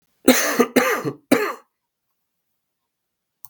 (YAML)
three_cough_length: 3.5 s
three_cough_amplitude: 32766
three_cough_signal_mean_std_ratio: 0.37
survey_phase: beta (2021-08-13 to 2022-03-07)
age: 18-44
gender: Male
wearing_mask: 'No'
symptom_cough_any: true
symptom_runny_or_blocked_nose: true
symptom_change_to_sense_of_smell_or_taste: true
symptom_loss_of_taste: true
symptom_onset: 3 days
smoker_status: Ex-smoker
respiratory_condition_asthma: false
respiratory_condition_other: false
recruitment_source: Test and Trace
submission_delay: 1 day
covid_test_result: Positive
covid_test_method: RT-qPCR